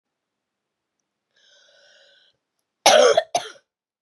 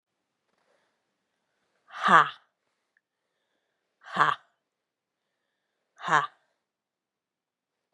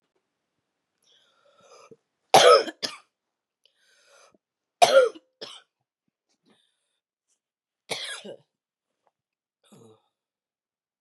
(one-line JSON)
{"cough_length": "4.0 s", "cough_amplitude": 29602, "cough_signal_mean_std_ratio": 0.26, "exhalation_length": "7.9 s", "exhalation_amplitude": 25472, "exhalation_signal_mean_std_ratio": 0.19, "three_cough_length": "11.0 s", "three_cough_amplitude": 28618, "three_cough_signal_mean_std_ratio": 0.2, "survey_phase": "beta (2021-08-13 to 2022-03-07)", "age": "45-64", "gender": "Female", "wearing_mask": "No", "symptom_cough_any": true, "symptom_runny_or_blocked_nose": true, "symptom_sore_throat": true, "symptom_fatigue": true, "symptom_fever_high_temperature": true, "symptom_headache": true, "symptom_change_to_sense_of_smell_or_taste": true, "symptom_loss_of_taste": true, "symptom_onset": "3 days", "smoker_status": "Never smoked", "respiratory_condition_asthma": false, "respiratory_condition_other": false, "recruitment_source": "Test and Trace", "submission_delay": "2 days", "covid_test_result": "Positive", "covid_test_method": "RT-qPCR", "covid_ct_value": 28.5, "covid_ct_gene": "ORF1ab gene", "covid_ct_mean": 28.9, "covid_viral_load": "330 copies/ml", "covid_viral_load_category": "Minimal viral load (< 10K copies/ml)"}